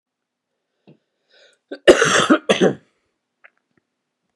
cough_length: 4.4 s
cough_amplitude: 32768
cough_signal_mean_std_ratio: 0.29
survey_phase: beta (2021-08-13 to 2022-03-07)
age: 18-44
gender: Male
wearing_mask: 'No'
symptom_cough_any: true
symptom_runny_or_blocked_nose: true
symptom_shortness_of_breath: true
symptom_fatigue: true
symptom_change_to_sense_of_smell_or_taste: true
symptom_loss_of_taste: true
symptom_onset: 5 days
smoker_status: Ex-smoker
respiratory_condition_asthma: false
respiratory_condition_other: false
recruitment_source: Test and Trace
submission_delay: 2 days
covid_test_result: Positive
covid_test_method: RT-qPCR
covid_ct_value: 22.4
covid_ct_gene: ORF1ab gene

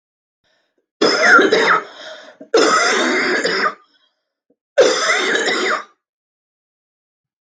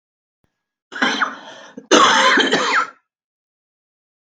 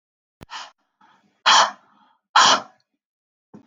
three_cough_length: 7.4 s
three_cough_amplitude: 32767
three_cough_signal_mean_std_ratio: 0.55
cough_length: 4.3 s
cough_amplitude: 32768
cough_signal_mean_std_ratio: 0.45
exhalation_length: 3.7 s
exhalation_amplitude: 29044
exhalation_signal_mean_std_ratio: 0.3
survey_phase: beta (2021-08-13 to 2022-03-07)
age: 45-64
gender: Female
wearing_mask: 'No'
symptom_shortness_of_breath: true
symptom_fatigue: true
symptom_onset: 4 days
smoker_status: Never smoked
respiratory_condition_asthma: false
respiratory_condition_other: false
recruitment_source: REACT
submission_delay: 1 day
covid_test_result: Negative
covid_test_method: RT-qPCR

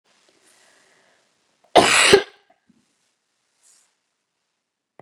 cough_length: 5.0 s
cough_amplitude: 32541
cough_signal_mean_std_ratio: 0.23
survey_phase: beta (2021-08-13 to 2022-03-07)
age: 45-64
gender: Female
wearing_mask: 'No'
symptom_cough_any: true
symptom_runny_or_blocked_nose: true
symptom_sore_throat: true
symptom_fatigue: true
symptom_headache: true
symptom_change_to_sense_of_smell_or_taste: true
symptom_loss_of_taste: true
symptom_onset: 5 days
smoker_status: Never smoked
respiratory_condition_asthma: false
respiratory_condition_other: false
recruitment_source: Test and Trace
submission_delay: 2 days
covid_test_result: Positive
covid_test_method: RT-qPCR
covid_ct_value: 16.3
covid_ct_gene: ORF1ab gene
covid_ct_mean: 16.6
covid_viral_load: 3700000 copies/ml
covid_viral_load_category: High viral load (>1M copies/ml)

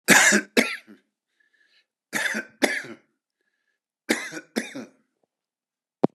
cough_length: 6.1 s
cough_amplitude: 32662
cough_signal_mean_std_ratio: 0.32
survey_phase: beta (2021-08-13 to 2022-03-07)
age: 65+
gender: Male
wearing_mask: 'No'
symptom_none: true
smoker_status: Ex-smoker
respiratory_condition_asthma: false
respiratory_condition_other: false
recruitment_source: REACT
submission_delay: 1 day
covid_test_result: Negative
covid_test_method: RT-qPCR
influenza_a_test_result: Negative
influenza_b_test_result: Negative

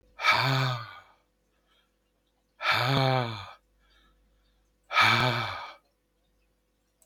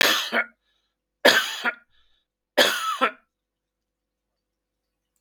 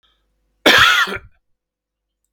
exhalation_length: 7.1 s
exhalation_amplitude: 12016
exhalation_signal_mean_std_ratio: 0.43
three_cough_length: 5.2 s
three_cough_amplitude: 25970
three_cough_signal_mean_std_ratio: 0.35
cough_length: 2.3 s
cough_amplitude: 32768
cough_signal_mean_std_ratio: 0.36
survey_phase: beta (2021-08-13 to 2022-03-07)
age: 65+
gender: Male
wearing_mask: 'No'
symptom_none: true
smoker_status: Never smoked
respiratory_condition_asthma: false
respiratory_condition_other: false
recruitment_source: REACT
submission_delay: 2 days
covid_test_result: Negative
covid_test_method: RT-qPCR
influenza_a_test_result: Negative
influenza_b_test_result: Negative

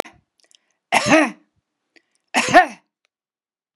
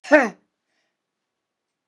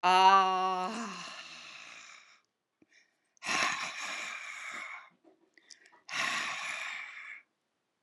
three_cough_length: 3.8 s
three_cough_amplitude: 32767
three_cough_signal_mean_std_ratio: 0.3
cough_length: 1.9 s
cough_amplitude: 32719
cough_signal_mean_std_ratio: 0.22
exhalation_length: 8.0 s
exhalation_amplitude: 9912
exhalation_signal_mean_std_ratio: 0.44
survey_phase: beta (2021-08-13 to 2022-03-07)
age: 65+
gender: Female
wearing_mask: 'No'
symptom_none: true
smoker_status: Never smoked
respiratory_condition_asthma: false
respiratory_condition_other: false
recruitment_source: REACT
submission_delay: 1 day
covid_test_result: Negative
covid_test_method: RT-qPCR
influenza_a_test_result: Negative
influenza_b_test_result: Negative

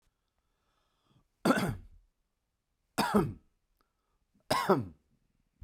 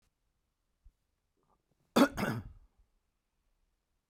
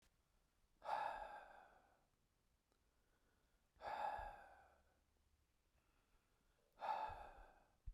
three_cough_length: 5.6 s
three_cough_amplitude: 7841
three_cough_signal_mean_std_ratio: 0.32
cough_length: 4.1 s
cough_amplitude: 8512
cough_signal_mean_std_ratio: 0.21
exhalation_length: 7.9 s
exhalation_amplitude: 790
exhalation_signal_mean_std_ratio: 0.41
survey_phase: beta (2021-08-13 to 2022-03-07)
age: 45-64
gender: Male
wearing_mask: 'No'
symptom_none: true
smoker_status: Never smoked
respiratory_condition_asthma: false
respiratory_condition_other: false
recruitment_source: REACT
submission_delay: 3 days
covid_test_result: Negative
covid_test_method: RT-qPCR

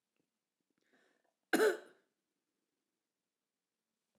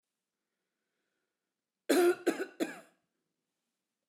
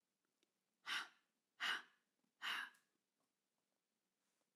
cough_length: 4.2 s
cough_amplitude: 3898
cough_signal_mean_std_ratio: 0.19
three_cough_length: 4.1 s
three_cough_amplitude: 6697
three_cough_signal_mean_std_ratio: 0.28
exhalation_length: 4.6 s
exhalation_amplitude: 1046
exhalation_signal_mean_std_ratio: 0.31
survey_phase: beta (2021-08-13 to 2022-03-07)
age: 45-64
gender: Female
wearing_mask: 'No'
symptom_sore_throat: true
symptom_fatigue: true
symptom_onset: 12 days
smoker_status: Never smoked
respiratory_condition_asthma: false
respiratory_condition_other: false
recruitment_source: REACT
submission_delay: 4 days
covid_test_result: Negative
covid_test_method: RT-qPCR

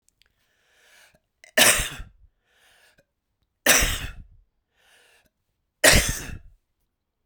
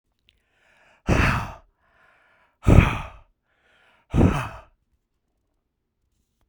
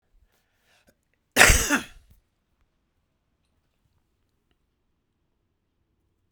three_cough_length: 7.3 s
three_cough_amplitude: 32236
three_cough_signal_mean_std_ratio: 0.29
exhalation_length: 6.5 s
exhalation_amplitude: 32768
exhalation_signal_mean_std_ratio: 0.29
cough_length: 6.3 s
cough_amplitude: 32768
cough_signal_mean_std_ratio: 0.19
survey_phase: beta (2021-08-13 to 2022-03-07)
age: 45-64
gender: Male
wearing_mask: 'No'
symptom_none: true
smoker_status: Never smoked
respiratory_condition_asthma: true
respiratory_condition_other: false
recruitment_source: REACT
submission_delay: 1 day
covid_test_result: Negative
covid_test_method: RT-qPCR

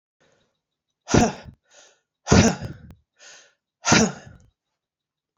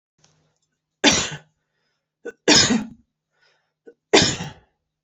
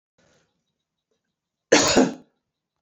exhalation_length: 5.4 s
exhalation_amplitude: 27664
exhalation_signal_mean_std_ratio: 0.3
three_cough_length: 5.0 s
three_cough_amplitude: 32372
three_cough_signal_mean_std_ratio: 0.32
cough_length: 2.8 s
cough_amplitude: 28472
cough_signal_mean_std_ratio: 0.28
survey_phase: alpha (2021-03-01 to 2021-08-12)
age: 45-64
gender: Female
wearing_mask: 'No'
symptom_cough_any: true
symptom_abdominal_pain: true
symptom_fatigue: true
symptom_headache: true
smoker_status: Never smoked
respiratory_condition_asthma: false
respiratory_condition_other: false
recruitment_source: Test and Trace
submission_delay: 0 days
covid_test_result: Positive
covid_test_method: RT-qPCR
covid_ct_value: 15.1
covid_ct_gene: N gene
covid_ct_mean: 15.2
covid_viral_load: 11000000 copies/ml
covid_viral_load_category: High viral load (>1M copies/ml)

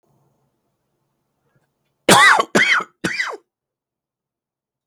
three_cough_length: 4.9 s
three_cough_amplitude: 32768
three_cough_signal_mean_std_ratio: 0.32
survey_phase: beta (2021-08-13 to 2022-03-07)
age: 45-64
gender: Male
wearing_mask: 'No'
symptom_cough_any: true
symptom_shortness_of_breath: true
symptom_fatigue: true
symptom_headache: true
symptom_change_to_sense_of_smell_or_taste: true
symptom_onset: 12 days
smoker_status: Ex-smoker
respiratory_condition_asthma: true
respiratory_condition_other: false
recruitment_source: REACT
submission_delay: 4 days
covid_test_result: Positive
covid_test_method: RT-qPCR
covid_ct_value: 24.0
covid_ct_gene: E gene
influenza_a_test_result: Negative
influenza_b_test_result: Negative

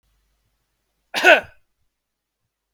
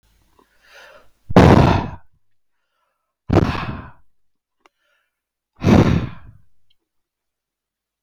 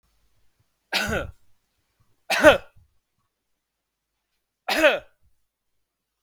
cough_length: 2.7 s
cough_amplitude: 32768
cough_signal_mean_std_ratio: 0.21
exhalation_length: 8.0 s
exhalation_amplitude: 32768
exhalation_signal_mean_std_ratio: 0.31
three_cough_length: 6.2 s
three_cough_amplitude: 32766
three_cough_signal_mean_std_ratio: 0.25
survey_phase: beta (2021-08-13 to 2022-03-07)
age: 45-64
gender: Male
wearing_mask: 'No'
symptom_none: true
smoker_status: Ex-smoker
respiratory_condition_asthma: false
respiratory_condition_other: false
recruitment_source: REACT
submission_delay: 0 days
covid_test_result: Negative
covid_test_method: RT-qPCR
influenza_a_test_result: Negative
influenza_b_test_result: Negative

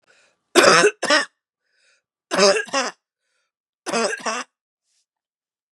three_cough_length: 5.7 s
three_cough_amplitude: 32560
three_cough_signal_mean_std_ratio: 0.36
survey_phase: beta (2021-08-13 to 2022-03-07)
age: 45-64
gender: Female
wearing_mask: 'No'
symptom_cough_any: true
symptom_runny_or_blocked_nose: true
symptom_sore_throat: true
symptom_headache: true
symptom_other: true
symptom_onset: 2 days
smoker_status: Ex-smoker
respiratory_condition_asthma: false
respiratory_condition_other: false
recruitment_source: Test and Trace
submission_delay: 1 day
covid_test_result: Positive
covid_test_method: RT-qPCR
covid_ct_value: 27.6
covid_ct_gene: ORF1ab gene
covid_ct_mean: 27.6
covid_viral_load: 880 copies/ml
covid_viral_load_category: Minimal viral load (< 10K copies/ml)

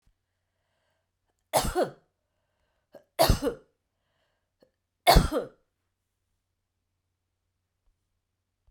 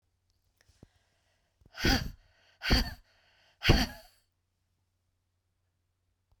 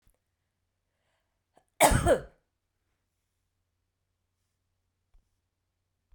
three_cough_length: 8.7 s
three_cough_amplitude: 17871
three_cough_signal_mean_std_ratio: 0.23
exhalation_length: 6.4 s
exhalation_amplitude: 12856
exhalation_signal_mean_std_ratio: 0.26
cough_length: 6.1 s
cough_amplitude: 14217
cough_signal_mean_std_ratio: 0.19
survey_phase: beta (2021-08-13 to 2022-03-07)
age: 45-64
gender: Female
wearing_mask: 'No'
symptom_none: true
smoker_status: Never smoked
respiratory_condition_asthma: false
respiratory_condition_other: false
recruitment_source: REACT
submission_delay: 1 day
covid_test_result: Negative
covid_test_method: RT-qPCR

